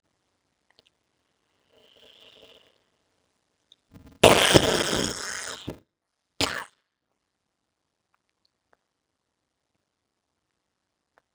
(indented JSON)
{
  "cough_length": "11.3 s",
  "cough_amplitude": 32768,
  "cough_signal_mean_std_ratio": 0.17,
  "survey_phase": "beta (2021-08-13 to 2022-03-07)",
  "age": "65+",
  "gender": "Female",
  "wearing_mask": "No",
  "symptom_cough_any": true,
  "symptom_new_continuous_cough": true,
  "symptom_runny_or_blocked_nose": true,
  "symptom_sore_throat": true,
  "symptom_fatigue": true,
  "symptom_fever_high_temperature": true,
  "symptom_headache": true,
  "symptom_other": true,
  "symptom_onset": "3 days",
  "smoker_status": "Never smoked",
  "respiratory_condition_asthma": false,
  "respiratory_condition_other": true,
  "recruitment_source": "Test and Trace",
  "submission_delay": "2 days",
  "covid_test_result": "Positive",
  "covid_test_method": "RT-qPCR",
  "covid_ct_value": 13.8,
  "covid_ct_gene": "N gene",
  "covid_ct_mean": 14.0,
  "covid_viral_load": "26000000 copies/ml",
  "covid_viral_load_category": "High viral load (>1M copies/ml)"
}